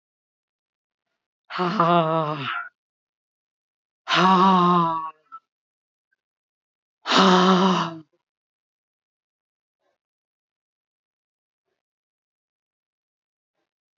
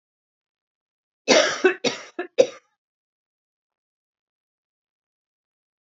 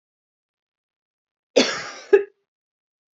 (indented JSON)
{
  "exhalation_length": "14.0 s",
  "exhalation_amplitude": 20058,
  "exhalation_signal_mean_std_ratio": 0.35,
  "three_cough_length": "5.8 s",
  "three_cough_amplitude": 26169,
  "three_cough_signal_mean_std_ratio": 0.23,
  "cough_length": "3.2 s",
  "cough_amplitude": 25804,
  "cough_signal_mean_std_ratio": 0.23,
  "survey_phase": "beta (2021-08-13 to 2022-03-07)",
  "age": "18-44",
  "gender": "Female",
  "wearing_mask": "No",
  "symptom_cough_any": true,
  "symptom_runny_or_blocked_nose": true,
  "symptom_shortness_of_breath": true,
  "symptom_abdominal_pain": true,
  "symptom_onset": "3 days",
  "smoker_status": "Never smoked",
  "respiratory_condition_asthma": false,
  "respiratory_condition_other": false,
  "recruitment_source": "REACT",
  "submission_delay": "1 day",
  "covid_test_result": "Negative",
  "covid_test_method": "RT-qPCR",
  "influenza_a_test_result": "Unknown/Void",
  "influenza_b_test_result": "Unknown/Void"
}